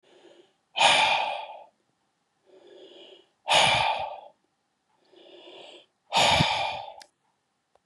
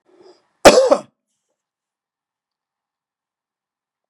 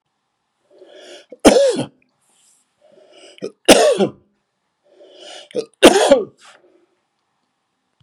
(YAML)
exhalation_length: 7.9 s
exhalation_amplitude: 16131
exhalation_signal_mean_std_ratio: 0.42
cough_length: 4.1 s
cough_amplitude: 32768
cough_signal_mean_std_ratio: 0.21
three_cough_length: 8.0 s
three_cough_amplitude: 32768
three_cough_signal_mean_std_ratio: 0.31
survey_phase: beta (2021-08-13 to 2022-03-07)
age: 65+
gender: Male
wearing_mask: 'No'
symptom_prefer_not_to_say: true
smoker_status: Never smoked
respiratory_condition_asthma: false
respiratory_condition_other: false
recruitment_source: REACT
submission_delay: 2 days
covid_test_result: Negative
covid_test_method: RT-qPCR
influenza_a_test_result: Negative
influenza_b_test_result: Negative